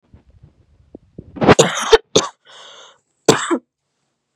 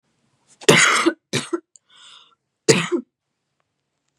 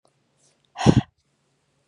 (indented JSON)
{
  "cough_length": "4.4 s",
  "cough_amplitude": 32768,
  "cough_signal_mean_std_ratio": 0.31,
  "three_cough_length": "4.2 s",
  "three_cough_amplitude": 32768,
  "three_cough_signal_mean_std_ratio": 0.34,
  "exhalation_length": "1.9 s",
  "exhalation_amplitude": 32119,
  "exhalation_signal_mean_std_ratio": 0.22,
  "survey_phase": "beta (2021-08-13 to 2022-03-07)",
  "age": "18-44",
  "gender": "Female",
  "wearing_mask": "No",
  "symptom_sore_throat": true,
  "smoker_status": "Never smoked",
  "respiratory_condition_asthma": false,
  "respiratory_condition_other": false,
  "recruitment_source": "REACT",
  "submission_delay": "1 day",
  "covid_test_result": "Negative",
  "covid_test_method": "RT-qPCR",
  "influenza_a_test_result": "Negative",
  "influenza_b_test_result": "Negative"
}